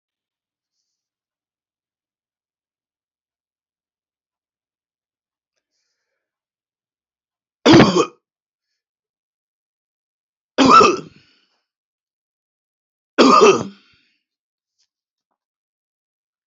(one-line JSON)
{"cough_length": "16.5 s", "cough_amplitude": 30201, "cough_signal_mean_std_ratio": 0.22, "survey_phase": "alpha (2021-03-01 to 2021-08-12)", "age": "65+", "gender": "Male", "wearing_mask": "No", "symptom_none": true, "smoker_status": "Never smoked", "respiratory_condition_asthma": false, "respiratory_condition_other": false, "recruitment_source": "REACT", "submission_delay": "3 days", "covid_test_result": "Negative", "covid_test_method": "RT-qPCR"}